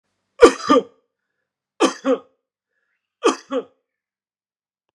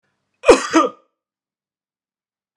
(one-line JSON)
{"three_cough_length": "4.9 s", "three_cough_amplitude": 32768, "three_cough_signal_mean_std_ratio": 0.27, "cough_length": "2.6 s", "cough_amplitude": 32768, "cough_signal_mean_std_ratio": 0.26, "survey_phase": "beta (2021-08-13 to 2022-03-07)", "age": "65+", "gender": "Male", "wearing_mask": "No", "symptom_headache": true, "symptom_onset": "8 days", "smoker_status": "Never smoked", "respiratory_condition_asthma": false, "respiratory_condition_other": false, "recruitment_source": "REACT", "submission_delay": "0 days", "covid_test_result": "Negative", "covid_test_method": "RT-qPCR"}